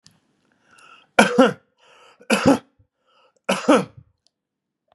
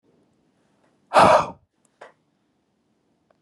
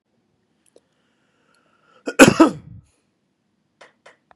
{
  "three_cough_length": "4.9 s",
  "three_cough_amplitude": 32768,
  "three_cough_signal_mean_std_ratio": 0.31,
  "exhalation_length": "3.4 s",
  "exhalation_amplitude": 28565,
  "exhalation_signal_mean_std_ratio": 0.25,
  "cough_length": "4.4 s",
  "cough_amplitude": 32768,
  "cough_signal_mean_std_ratio": 0.19,
  "survey_phase": "beta (2021-08-13 to 2022-03-07)",
  "age": "45-64",
  "gender": "Male",
  "wearing_mask": "No",
  "symptom_none": true,
  "smoker_status": "Ex-smoker",
  "respiratory_condition_asthma": false,
  "respiratory_condition_other": false,
  "recruitment_source": "REACT",
  "submission_delay": "1 day",
  "covid_test_result": "Negative",
  "covid_test_method": "RT-qPCR",
  "influenza_a_test_result": "Negative",
  "influenza_b_test_result": "Negative"
}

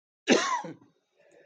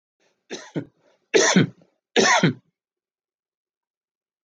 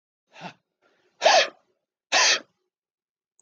{
  "cough_length": "1.5 s",
  "cough_amplitude": 15115,
  "cough_signal_mean_std_ratio": 0.38,
  "three_cough_length": "4.4 s",
  "three_cough_amplitude": 22015,
  "three_cough_signal_mean_std_ratio": 0.34,
  "exhalation_length": "3.4 s",
  "exhalation_amplitude": 16776,
  "exhalation_signal_mean_std_ratio": 0.32,
  "survey_phase": "alpha (2021-03-01 to 2021-08-12)",
  "age": "65+",
  "gender": "Male",
  "wearing_mask": "No",
  "symptom_none": true,
  "smoker_status": "Ex-smoker",
  "respiratory_condition_asthma": false,
  "respiratory_condition_other": false,
  "recruitment_source": "REACT",
  "submission_delay": "2 days",
  "covid_test_result": "Negative",
  "covid_test_method": "RT-qPCR"
}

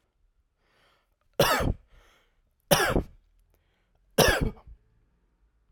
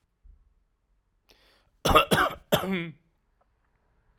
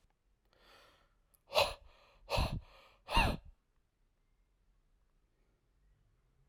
{
  "three_cough_length": "5.7 s",
  "three_cough_amplitude": 19550,
  "three_cough_signal_mean_std_ratio": 0.32,
  "cough_length": "4.2 s",
  "cough_amplitude": 21105,
  "cough_signal_mean_std_ratio": 0.31,
  "exhalation_length": "6.5 s",
  "exhalation_amplitude": 5484,
  "exhalation_signal_mean_std_ratio": 0.28,
  "survey_phase": "alpha (2021-03-01 to 2021-08-12)",
  "age": "18-44",
  "gender": "Male",
  "wearing_mask": "No",
  "symptom_none": true,
  "smoker_status": "Ex-smoker",
  "respiratory_condition_asthma": false,
  "respiratory_condition_other": false,
  "recruitment_source": "REACT",
  "submission_delay": "7 days",
  "covid_test_result": "Negative",
  "covid_test_method": "RT-qPCR"
}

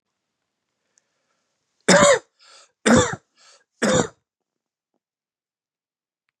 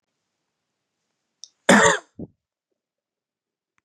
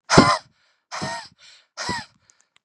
{
  "three_cough_length": "6.4 s",
  "three_cough_amplitude": 29515,
  "three_cough_signal_mean_std_ratio": 0.28,
  "cough_length": "3.8 s",
  "cough_amplitude": 30479,
  "cough_signal_mean_std_ratio": 0.22,
  "exhalation_length": "2.6 s",
  "exhalation_amplitude": 32768,
  "exhalation_signal_mean_std_ratio": 0.33,
  "survey_phase": "beta (2021-08-13 to 2022-03-07)",
  "age": "18-44",
  "gender": "Male",
  "wearing_mask": "No",
  "symptom_fatigue": true,
  "symptom_onset": "12 days",
  "smoker_status": "Never smoked",
  "respiratory_condition_asthma": true,
  "respiratory_condition_other": false,
  "recruitment_source": "REACT",
  "submission_delay": "2 days",
  "covid_test_result": "Negative",
  "covid_test_method": "RT-qPCR",
  "influenza_a_test_result": "Negative",
  "influenza_b_test_result": "Negative"
}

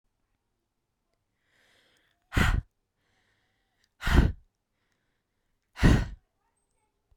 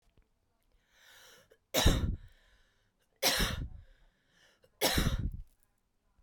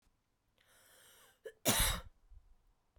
{
  "exhalation_length": "7.2 s",
  "exhalation_amplitude": 16173,
  "exhalation_signal_mean_std_ratio": 0.25,
  "three_cough_length": "6.2 s",
  "three_cough_amplitude": 7233,
  "three_cough_signal_mean_std_ratio": 0.38,
  "cough_length": "3.0 s",
  "cough_amplitude": 4769,
  "cough_signal_mean_std_ratio": 0.31,
  "survey_phase": "beta (2021-08-13 to 2022-03-07)",
  "age": "18-44",
  "gender": "Female",
  "wearing_mask": "No",
  "symptom_none": true,
  "smoker_status": "Current smoker (e-cigarettes or vapes only)",
  "respiratory_condition_asthma": false,
  "respiratory_condition_other": false,
  "recruitment_source": "REACT",
  "submission_delay": "1 day",
  "covid_test_result": "Negative",
  "covid_test_method": "RT-qPCR"
}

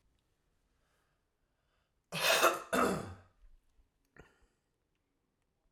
{
  "cough_length": "5.7 s",
  "cough_amplitude": 6051,
  "cough_signal_mean_std_ratio": 0.29,
  "survey_phase": "alpha (2021-03-01 to 2021-08-12)",
  "age": "18-44",
  "gender": "Male",
  "wearing_mask": "No",
  "symptom_none": true,
  "smoker_status": "Ex-smoker",
  "respiratory_condition_asthma": false,
  "respiratory_condition_other": false,
  "recruitment_source": "REACT",
  "submission_delay": "1 day",
  "covid_test_result": "Negative",
  "covid_test_method": "RT-qPCR"
}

